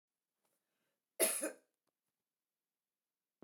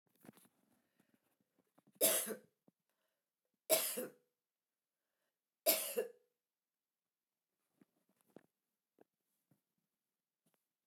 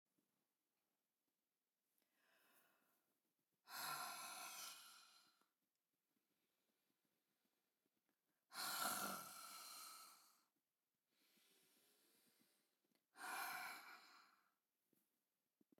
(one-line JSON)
{"cough_length": "3.4 s", "cough_amplitude": 3880, "cough_signal_mean_std_ratio": 0.22, "three_cough_length": "10.9 s", "three_cough_amplitude": 5179, "three_cough_signal_mean_std_ratio": 0.23, "exhalation_length": "15.8 s", "exhalation_amplitude": 803, "exhalation_signal_mean_std_ratio": 0.38, "survey_phase": "beta (2021-08-13 to 2022-03-07)", "age": "65+", "gender": "Female", "wearing_mask": "No", "symptom_none": true, "smoker_status": "Never smoked", "respiratory_condition_asthma": false, "respiratory_condition_other": false, "recruitment_source": "REACT", "submission_delay": "1 day", "covid_test_result": "Negative", "covid_test_method": "RT-qPCR"}